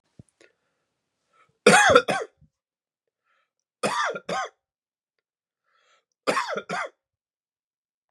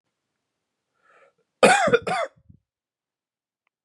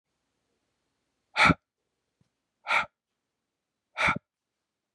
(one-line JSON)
{"three_cough_length": "8.1 s", "three_cough_amplitude": 30567, "three_cough_signal_mean_std_ratio": 0.28, "cough_length": "3.8 s", "cough_amplitude": 28624, "cough_signal_mean_std_ratio": 0.28, "exhalation_length": "4.9 s", "exhalation_amplitude": 13429, "exhalation_signal_mean_std_ratio": 0.24, "survey_phase": "beta (2021-08-13 to 2022-03-07)", "age": "18-44", "gender": "Male", "wearing_mask": "No", "symptom_cough_any": true, "symptom_sore_throat": true, "symptom_fatigue": true, "symptom_change_to_sense_of_smell_or_taste": true, "symptom_loss_of_taste": true, "symptom_onset": "5 days", "smoker_status": "Never smoked", "respiratory_condition_asthma": false, "respiratory_condition_other": false, "recruitment_source": "Test and Trace", "submission_delay": "2 days", "covid_test_result": "Positive", "covid_test_method": "RT-qPCR", "covid_ct_value": 16.4, "covid_ct_gene": "ORF1ab gene", "covid_ct_mean": 17.2, "covid_viral_load": "2300000 copies/ml", "covid_viral_load_category": "High viral load (>1M copies/ml)"}